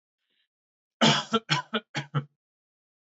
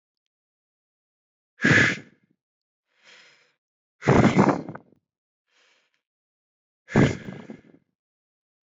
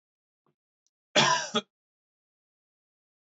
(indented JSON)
{
  "three_cough_length": "3.1 s",
  "three_cough_amplitude": 15076,
  "three_cough_signal_mean_std_ratio": 0.34,
  "exhalation_length": "8.8 s",
  "exhalation_amplitude": 18913,
  "exhalation_signal_mean_std_ratio": 0.28,
  "cough_length": "3.3 s",
  "cough_amplitude": 11528,
  "cough_signal_mean_std_ratio": 0.25,
  "survey_phase": "beta (2021-08-13 to 2022-03-07)",
  "age": "18-44",
  "gender": "Male",
  "wearing_mask": "No",
  "symptom_none": true,
  "smoker_status": "Never smoked",
  "respiratory_condition_asthma": true,
  "respiratory_condition_other": false,
  "recruitment_source": "REACT",
  "submission_delay": "2 days",
  "covid_test_result": "Negative",
  "covid_test_method": "RT-qPCR"
}